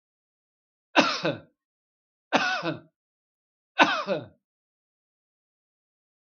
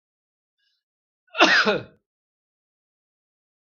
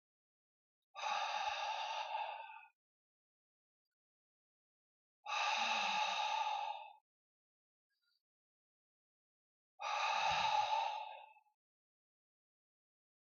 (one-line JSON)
{"three_cough_length": "6.2 s", "three_cough_amplitude": 22516, "three_cough_signal_mean_std_ratio": 0.3, "cough_length": "3.8 s", "cough_amplitude": 28337, "cough_signal_mean_std_ratio": 0.26, "exhalation_length": "13.3 s", "exhalation_amplitude": 1934, "exhalation_signal_mean_std_ratio": 0.49, "survey_phase": "alpha (2021-03-01 to 2021-08-12)", "age": "45-64", "gender": "Male", "wearing_mask": "No", "symptom_none": true, "smoker_status": "Never smoked", "respiratory_condition_asthma": false, "respiratory_condition_other": false, "recruitment_source": "REACT", "submission_delay": "1 day", "covid_test_result": "Negative", "covid_test_method": "RT-qPCR"}